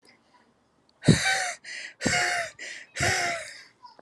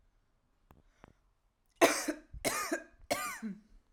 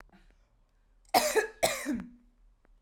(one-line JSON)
{"exhalation_length": "4.0 s", "exhalation_amplitude": 21330, "exhalation_signal_mean_std_ratio": 0.5, "three_cough_length": "3.9 s", "three_cough_amplitude": 10829, "three_cough_signal_mean_std_ratio": 0.36, "cough_length": "2.8 s", "cough_amplitude": 11681, "cough_signal_mean_std_ratio": 0.39, "survey_phase": "alpha (2021-03-01 to 2021-08-12)", "age": "18-44", "gender": "Female", "wearing_mask": "No", "symptom_none": true, "smoker_status": "Never smoked", "respiratory_condition_asthma": false, "respiratory_condition_other": false, "recruitment_source": "REACT", "submission_delay": "2 days", "covid_test_result": "Negative", "covid_test_method": "RT-qPCR"}